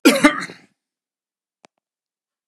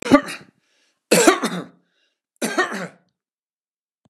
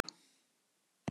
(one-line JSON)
{"cough_length": "2.5 s", "cough_amplitude": 32767, "cough_signal_mean_std_ratio": 0.25, "three_cough_length": "4.1 s", "three_cough_amplitude": 32767, "three_cough_signal_mean_std_ratio": 0.34, "exhalation_length": "1.1 s", "exhalation_amplitude": 6862, "exhalation_signal_mean_std_ratio": 0.14, "survey_phase": "beta (2021-08-13 to 2022-03-07)", "age": "45-64", "gender": "Male", "wearing_mask": "No", "symptom_none": true, "smoker_status": "Never smoked", "respiratory_condition_asthma": false, "respiratory_condition_other": false, "recruitment_source": "REACT", "submission_delay": "1 day", "covid_test_result": "Negative", "covid_test_method": "RT-qPCR"}